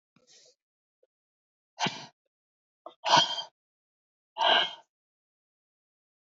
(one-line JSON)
{"exhalation_length": "6.2 s", "exhalation_amplitude": 12122, "exhalation_signal_mean_std_ratio": 0.27, "survey_phase": "beta (2021-08-13 to 2022-03-07)", "age": "45-64", "gender": "Female", "wearing_mask": "No", "symptom_cough_any": true, "symptom_runny_or_blocked_nose": true, "symptom_sore_throat": true, "symptom_abdominal_pain": true, "symptom_diarrhoea": true, "symptom_fatigue": true, "symptom_headache": true, "symptom_change_to_sense_of_smell_or_taste": true, "smoker_status": "Current smoker (e-cigarettes or vapes only)", "respiratory_condition_asthma": false, "respiratory_condition_other": false, "recruitment_source": "Test and Trace", "submission_delay": "1 day", "covid_test_result": "Positive", "covid_test_method": "RT-qPCR", "covid_ct_value": 20.2, "covid_ct_gene": "N gene", "covid_ct_mean": 21.2, "covid_viral_load": "110000 copies/ml", "covid_viral_load_category": "Low viral load (10K-1M copies/ml)"}